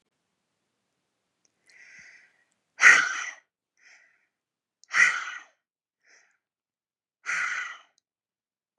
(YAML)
exhalation_length: 8.8 s
exhalation_amplitude: 24986
exhalation_signal_mean_std_ratio: 0.24
survey_phase: beta (2021-08-13 to 2022-03-07)
age: 18-44
gender: Female
wearing_mask: 'No'
symptom_none: true
smoker_status: Never smoked
respiratory_condition_asthma: false
respiratory_condition_other: false
recruitment_source: REACT
submission_delay: 4 days
covid_test_result: Negative
covid_test_method: RT-qPCR
influenza_a_test_result: Negative
influenza_b_test_result: Negative